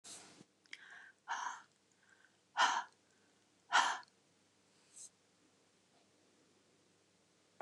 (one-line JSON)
{"exhalation_length": "7.6 s", "exhalation_amplitude": 4692, "exhalation_signal_mean_std_ratio": 0.27, "survey_phase": "beta (2021-08-13 to 2022-03-07)", "age": "45-64", "gender": "Female", "wearing_mask": "No", "symptom_none": true, "smoker_status": "Never smoked", "respiratory_condition_asthma": false, "respiratory_condition_other": false, "recruitment_source": "REACT", "submission_delay": "2 days", "covid_test_result": "Negative", "covid_test_method": "RT-qPCR", "influenza_a_test_result": "Negative", "influenza_b_test_result": "Negative"}